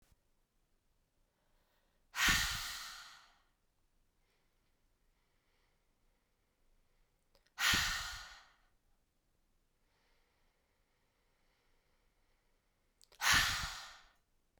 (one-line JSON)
{"exhalation_length": "14.6 s", "exhalation_amplitude": 4877, "exhalation_signal_mean_std_ratio": 0.28, "survey_phase": "beta (2021-08-13 to 2022-03-07)", "age": "18-44", "gender": "Female", "wearing_mask": "No", "symptom_cough_any": true, "symptom_new_continuous_cough": true, "symptom_onset": "4 days", "smoker_status": "Never smoked", "respiratory_condition_asthma": false, "respiratory_condition_other": false, "recruitment_source": "REACT", "submission_delay": "1 day", "covid_test_result": "Negative", "covid_test_method": "RT-qPCR"}